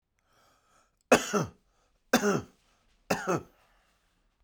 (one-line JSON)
{"three_cough_length": "4.4 s", "three_cough_amplitude": 16969, "three_cough_signal_mean_std_ratio": 0.31, "survey_phase": "beta (2021-08-13 to 2022-03-07)", "age": "45-64", "gender": "Male", "wearing_mask": "No", "symptom_cough_any": true, "symptom_runny_or_blocked_nose": true, "symptom_shortness_of_breath": true, "symptom_sore_throat": true, "symptom_diarrhoea": true, "symptom_fatigue": true, "symptom_fever_high_temperature": true, "symptom_headache": true, "symptom_other": true, "symptom_onset": "3 days", "smoker_status": "Ex-smoker", "respiratory_condition_asthma": false, "respiratory_condition_other": false, "recruitment_source": "Test and Trace", "submission_delay": "2 days", "covid_test_result": "Positive", "covid_test_method": "RT-qPCR"}